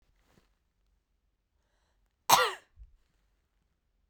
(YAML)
cough_length: 4.1 s
cough_amplitude: 17317
cough_signal_mean_std_ratio: 0.18
survey_phase: beta (2021-08-13 to 2022-03-07)
age: 18-44
gender: Female
wearing_mask: 'No'
symptom_none: true
smoker_status: Never smoked
respiratory_condition_asthma: false
respiratory_condition_other: false
recruitment_source: REACT
submission_delay: 1 day
covid_test_result: Negative
covid_test_method: RT-qPCR
influenza_a_test_result: Negative
influenza_b_test_result: Negative